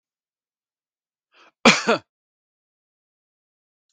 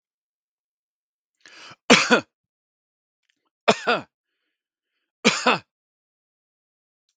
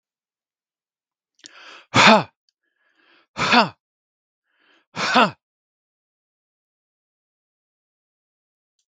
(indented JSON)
{
  "cough_length": "3.9 s",
  "cough_amplitude": 32768,
  "cough_signal_mean_std_ratio": 0.18,
  "three_cough_length": "7.2 s",
  "three_cough_amplitude": 32768,
  "three_cough_signal_mean_std_ratio": 0.23,
  "exhalation_length": "8.9 s",
  "exhalation_amplitude": 32768,
  "exhalation_signal_mean_std_ratio": 0.22,
  "survey_phase": "beta (2021-08-13 to 2022-03-07)",
  "age": "45-64",
  "gender": "Male",
  "wearing_mask": "No",
  "symptom_none": true,
  "smoker_status": "Never smoked",
  "respiratory_condition_asthma": false,
  "respiratory_condition_other": true,
  "recruitment_source": "REACT",
  "submission_delay": "3 days",
  "covid_test_result": "Negative",
  "covid_test_method": "RT-qPCR",
  "covid_ct_value": 40.0,
  "covid_ct_gene": "N gene",
  "influenza_a_test_result": "Negative",
  "influenza_b_test_result": "Negative"
}